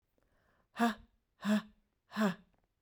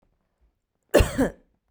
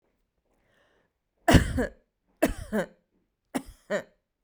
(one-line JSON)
{"exhalation_length": "2.8 s", "exhalation_amplitude": 4713, "exhalation_signal_mean_std_ratio": 0.35, "cough_length": "1.7 s", "cough_amplitude": 23262, "cough_signal_mean_std_ratio": 0.31, "three_cough_length": "4.4 s", "three_cough_amplitude": 20999, "three_cough_signal_mean_std_ratio": 0.29, "survey_phase": "beta (2021-08-13 to 2022-03-07)", "age": "45-64", "gender": "Female", "wearing_mask": "No", "symptom_none": true, "smoker_status": "Ex-smoker", "respiratory_condition_asthma": false, "respiratory_condition_other": false, "recruitment_source": "REACT", "submission_delay": "3 days", "covid_test_result": "Negative", "covid_test_method": "RT-qPCR"}